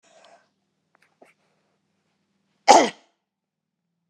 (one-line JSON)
{"cough_length": "4.1 s", "cough_amplitude": 32768, "cough_signal_mean_std_ratio": 0.17, "survey_phase": "beta (2021-08-13 to 2022-03-07)", "age": "65+", "gender": "Female", "wearing_mask": "No", "symptom_none": true, "symptom_onset": "13 days", "smoker_status": "Never smoked", "respiratory_condition_asthma": false, "respiratory_condition_other": false, "recruitment_source": "REACT", "submission_delay": "1 day", "covid_test_result": "Negative", "covid_test_method": "RT-qPCR"}